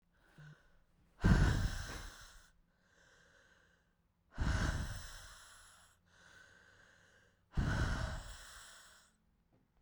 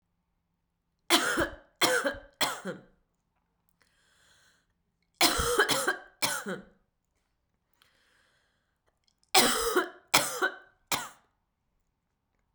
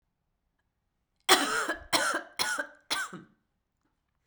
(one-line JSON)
{"exhalation_length": "9.8 s", "exhalation_amplitude": 5266, "exhalation_signal_mean_std_ratio": 0.39, "three_cough_length": "12.5 s", "three_cough_amplitude": 21471, "three_cough_signal_mean_std_ratio": 0.37, "cough_length": "4.3 s", "cough_amplitude": 20412, "cough_signal_mean_std_ratio": 0.39, "survey_phase": "beta (2021-08-13 to 2022-03-07)", "age": "18-44", "gender": "Female", "wearing_mask": "No", "symptom_new_continuous_cough": true, "symptom_runny_or_blocked_nose": true, "symptom_shortness_of_breath": true, "symptom_sore_throat": true, "symptom_fatigue": true, "symptom_headache": true, "symptom_other": true, "symptom_onset": "4 days", "smoker_status": "Ex-smoker", "respiratory_condition_asthma": false, "respiratory_condition_other": false, "recruitment_source": "Test and Trace", "submission_delay": "1 day", "covid_test_result": "Positive", "covid_test_method": "RT-qPCR", "covid_ct_value": 26.4, "covid_ct_gene": "N gene"}